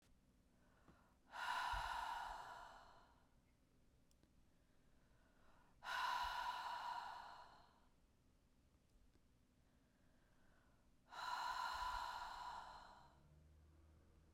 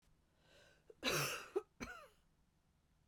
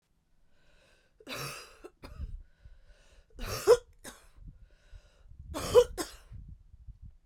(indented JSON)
{
  "exhalation_length": "14.3 s",
  "exhalation_amplitude": 729,
  "exhalation_signal_mean_std_ratio": 0.54,
  "cough_length": "3.1 s",
  "cough_amplitude": 1776,
  "cough_signal_mean_std_ratio": 0.37,
  "three_cough_length": "7.3 s",
  "three_cough_amplitude": 12619,
  "three_cough_signal_mean_std_ratio": 0.27,
  "survey_phase": "beta (2021-08-13 to 2022-03-07)",
  "age": "45-64",
  "gender": "Female",
  "wearing_mask": "No",
  "symptom_cough_any": true,
  "symptom_runny_or_blocked_nose": true,
  "symptom_shortness_of_breath": true,
  "symptom_sore_throat": true,
  "symptom_headache": true,
  "smoker_status": "Never smoked",
  "respiratory_condition_asthma": false,
  "respiratory_condition_other": false,
  "recruitment_source": "Test and Trace",
  "submission_delay": "1 day",
  "covid_test_result": "Positive",
  "covid_test_method": "RT-qPCR"
}